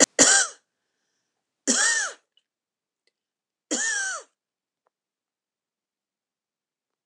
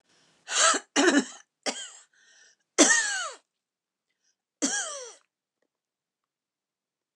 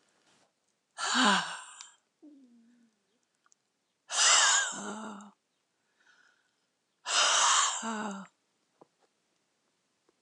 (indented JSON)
{
  "three_cough_length": "7.1 s",
  "three_cough_amplitude": 28250,
  "three_cough_signal_mean_std_ratio": 0.3,
  "cough_length": "7.2 s",
  "cough_amplitude": 22768,
  "cough_signal_mean_std_ratio": 0.34,
  "exhalation_length": "10.2 s",
  "exhalation_amplitude": 10846,
  "exhalation_signal_mean_std_ratio": 0.38,
  "survey_phase": "alpha (2021-03-01 to 2021-08-12)",
  "age": "65+",
  "gender": "Female",
  "wearing_mask": "No",
  "symptom_none": true,
  "smoker_status": "Never smoked",
  "respiratory_condition_asthma": false,
  "respiratory_condition_other": false,
  "recruitment_source": "REACT",
  "submission_delay": "1 day",
  "covid_test_result": "Negative",
  "covid_test_method": "RT-qPCR"
}